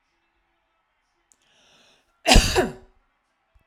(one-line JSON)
{"cough_length": "3.7 s", "cough_amplitude": 32768, "cough_signal_mean_std_ratio": 0.24, "survey_phase": "alpha (2021-03-01 to 2021-08-12)", "age": "45-64", "gender": "Female", "wearing_mask": "No", "symptom_none": true, "smoker_status": "Never smoked", "respiratory_condition_asthma": false, "respiratory_condition_other": false, "recruitment_source": "REACT", "submission_delay": "1 day", "covid_test_result": "Negative", "covid_test_method": "RT-qPCR"}